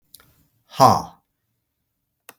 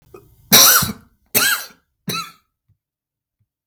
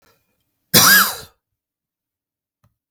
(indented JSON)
{
  "exhalation_length": "2.4 s",
  "exhalation_amplitude": 32768,
  "exhalation_signal_mean_std_ratio": 0.23,
  "three_cough_length": "3.7 s",
  "three_cough_amplitude": 32768,
  "three_cough_signal_mean_std_ratio": 0.35,
  "cough_length": "2.9 s",
  "cough_amplitude": 32768,
  "cough_signal_mean_std_ratio": 0.3,
  "survey_phase": "beta (2021-08-13 to 2022-03-07)",
  "age": "65+",
  "gender": "Male",
  "wearing_mask": "No",
  "symptom_none": true,
  "smoker_status": "Never smoked",
  "respiratory_condition_asthma": false,
  "respiratory_condition_other": false,
  "recruitment_source": "REACT",
  "submission_delay": "0 days",
  "covid_test_result": "Negative",
  "covid_test_method": "RT-qPCR",
  "influenza_a_test_result": "Negative",
  "influenza_b_test_result": "Negative"
}